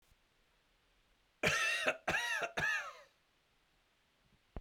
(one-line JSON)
{"three_cough_length": "4.6 s", "three_cough_amplitude": 5053, "three_cough_signal_mean_std_ratio": 0.45, "survey_phase": "beta (2021-08-13 to 2022-03-07)", "age": "45-64", "gender": "Male", "wearing_mask": "No", "symptom_diarrhoea": true, "symptom_fatigue": true, "symptom_fever_high_temperature": true, "symptom_headache": true, "symptom_change_to_sense_of_smell_or_taste": true, "smoker_status": "Never smoked", "respiratory_condition_asthma": false, "respiratory_condition_other": false, "recruitment_source": "Test and Trace", "submission_delay": "2 days", "covid_test_result": "Positive", "covid_test_method": "RT-qPCR", "covid_ct_value": 36.0, "covid_ct_gene": "ORF1ab gene", "covid_ct_mean": 36.4, "covid_viral_load": "1.1 copies/ml", "covid_viral_load_category": "Minimal viral load (< 10K copies/ml)"}